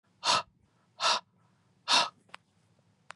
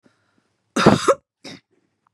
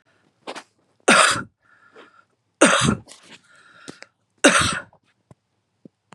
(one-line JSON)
{"exhalation_length": "3.2 s", "exhalation_amplitude": 8637, "exhalation_signal_mean_std_ratio": 0.34, "cough_length": "2.1 s", "cough_amplitude": 32768, "cough_signal_mean_std_ratio": 0.29, "three_cough_length": "6.1 s", "three_cough_amplitude": 32189, "three_cough_signal_mean_std_ratio": 0.32, "survey_phase": "beta (2021-08-13 to 2022-03-07)", "age": "45-64", "gender": "Female", "wearing_mask": "No", "symptom_shortness_of_breath": true, "symptom_sore_throat": true, "symptom_fatigue": true, "symptom_headache": true, "smoker_status": "Current smoker (1 to 10 cigarettes per day)", "respiratory_condition_asthma": false, "respiratory_condition_other": false, "recruitment_source": "Test and Trace", "submission_delay": "2 days", "covid_test_result": "Positive", "covid_test_method": "RT-qPCR", "covid_ct_value": 19.9, "covid_ct_gene": "N gene"}